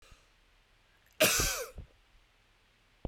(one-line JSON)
{"cough_length": "3.1 s", "cough_amplitude": 9136, "cough_signal_mean_std_ratio": 0.32, "survey_phase": "beta (2021-08-13 to 2022-03-07)", "age": "18-44", "gender": "Male", "wearing_mask": "No", "symptom_headache": true, "symptom_onset": "13 days", "smoker_status": "Never smoked", "respiratory_condition_asthma": false, "respiratory_condition_other": false, "recruitment_source": "REACT", "submission_delay": "0 days", "covid_test_result": "Negative", "covid_test_method": "RT-qPCR"}